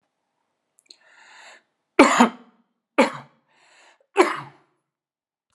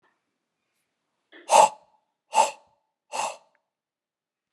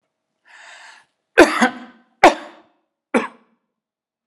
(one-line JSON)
{"three_cough_length": "5.5 s", "three_cough_amplitude": 32767, "three_cough_signal_mean_std_ratio": 0.24, "exhalation_length": "4.5 s", "exhalation_amplitude": 25313, "exhalation_signal_mean_std_ratio": 0.23, "cough_length": "4.3 s", "cough_amplitude": 32768, "cough_signal_mean_std_ratio": 0.24, "survey_phase": "alpha (2021-03-01 to 2021-08-12)", "age": "45-64", "gender": "Male", "wearing_mask": "No", "symptom_none": true, "smoker_status": "Never smoked", "respiratory_condition_asthma": false, "respiratory_condition_other": false, "recruitment_source": "REACT", "submission_delay": "3 days", "covid_test_result": "Negative", "covid_test_method": "RT-qPCR"}